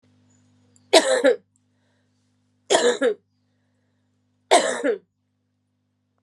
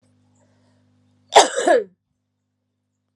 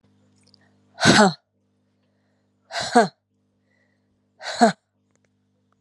{"three_cough_length": "6.2 s", "three_cough_amplitude": 31601, "three_cough_signal_mean_std_ratio": 0.33, "cough_length": "3.2 s", "cough_amplitude": 32768, "cough_signal_mean_std_ratio": 0.26, "exhalation_length": "5.8 s", "exhalation_amplitude": 30984, "exhalation_signal_mean_std_ratio": 0.27, "survey_phase": "alpha (2021-03-01 to 2021-08-12)", "age": "45-64", "gender": "Female", "wearing_mask": "No", "symptom_cough_any": true, "symptom_shortness_of_breath": true, "symptom_fatigue": true, "symptom_fever_high_temperature": true, "symptom_headache": true, "symptom_change_to_sense_of_smell_or_taste": true, "symptom_loss_of_taste": true, "symptom_onset": "5 days", "smoker_status": "Ex-smoker", "respiratory_condition_asthma": false, "respiratory_condition_other": false, "recruitment_source": "Test and Trace", "submission_delay": "4 days", "covid_test_result": "Positive", "covid_test_method": "RT-qPCR", "covid_ct_value": 14.0, "covid_ct_gene": "ORF1ab gene", "covid_ct_mean": 14.1, "covid_viral_load": "23000000 copies/ml", "covid_viral_load_category": "High viral load (>1M copies/ml)"}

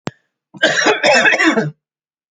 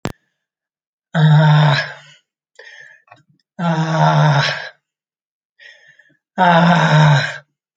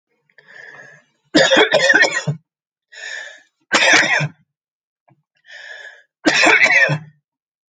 {"cough_length": "2.3 s", "cough_amplitude": 32768, "cough_signal_mean_std_ratio": 0.59, "exhalation_length": "7.8 s", "exhalation_amplitude": 28997, "exhalation_signal_mean_std_ratio": 0.53, "three_cough_length": "7.7 s", "three_cough_amplitude": 31304, "three_cough_signal_mean_std_ratio": 0.46, "survey_phase": "alpha (2021-03-01 to 2021-08-12)", "age": "45-64", "gender": "Male", "wearing_mask": "No", "symptom_none": true, "smoker_status": "Never smoked", "respiratory_condition_asthma": false, "respiratory_condition_other": false, "recruitment_source": "REACT", "submission_delay": "3 days", "covid_test_result": "Negative", "covid_test_method": "RT-qPCR"}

